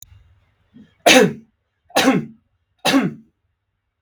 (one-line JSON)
{"three_cough_length": "4.0 s", "three_cough_amplitude": 32768, "three_cough_signal_mean_std_ratio": 0.35, "survey_phase": "beta (2021-08-13 to 2022-03-07)", "age": "18-44", "gender": "Male", "wearing_mask": "No", "symptom_none": true, "smoker_status": "Ex-smoker", "respiratory_condition_asthma": false, "respiratory_condition_other": false, "recruitment_source": "REACT", "submission_delay": "1 day", "covid_test_result": "Negative", "covid_test_method": "RT-qPCR", "influenza_a_test_result": "Negative", "influenza_b_test_result": "Negative"}